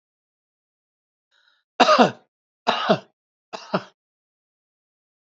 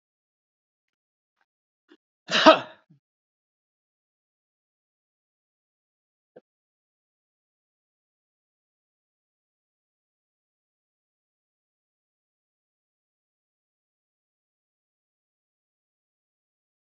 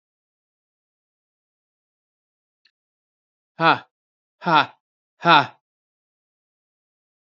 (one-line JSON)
{"three_cough_length": "5.4 s", "three_cough_amplitude": 28924, "three_cough_signal_mean_std_ratio": 0.25, "cough_length": "17.0 s", "cough_amplitude": 27642, "cough_signal_mean_std_ratio": 0.08, "exhalation_length": "7.3 s", "exhalation_amplitude": 26821, "exhalation_signal_mean_std_ratio": 0.2, "survey_phase": "alpha (2021-03-01 to 2021-08-12)", "age": "65+", "gender": "Male", "wearing_mask": "No", "symptom_abdominal_pain": true, "smoker_status": "Ex-smoker", "respiratory_condition_asthma": false, "respiratory_condition_other": false, "recruitment_source": "REACT", "submission_delay": "4 days", "covid_test_result": "Negative", "covid_test_method": "RT-qPCR"}